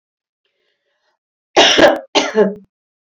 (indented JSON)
{
  "cough_length": "3.2 s",
  "cough_amplitude": 30106,
  "cough_signal_mean_std_ratio": 0.38,
  "survey_phase": "beta (2021-08-13 to 2022-03-07)",
  "age": "45-64",
  "gender": "Female",
  "wearing_mask": "No",
  "symptom_none": true,
  "smoker_status": "Never smoked",
  "respiratory_condition_asthma": false,
  "respiratory_condition_other": false,
  "recruitment_source": "REACT",
  "submission_delay": "1 day",
  "covid_test_result": "Negative",
  "covid_test_method": "RT-qPCR"
}